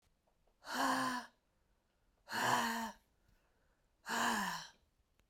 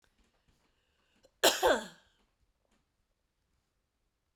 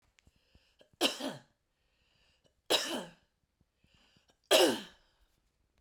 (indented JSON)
{
  "exhalation_length": "5.3 s",
  "exhalation_amplitude": 3247,
  "exhalation_signal_mean_std_ratio": 0.49,
  "cough_length": "4.4 s",
  "cough_amplitude": 9302,
  "cough_signal_mean_std_ratio": 0.22,
  "three_cough_length": "5.8 s",
  "three_cough_amplitude": 9420,
  "three_cough_signal_mean_std_ratio": 0.28,
  "survey_phase": "beta (2021-08-13 to 2022-03-07)",
  "age": "65+",
  "gender": "Female",
  "wearing_mask": "No",
  "symptom_none": true,
  "smoker_status": "Ex-smoker",
  "respiratory_condition_asthma": false,
  "respiratory_condition_other": false,
  "recruitment_source": "Test and Trace",
  "submission_delay": "3 days",
  "covid_test_result": "Negative",
  "covid_test_method": "LFT"
}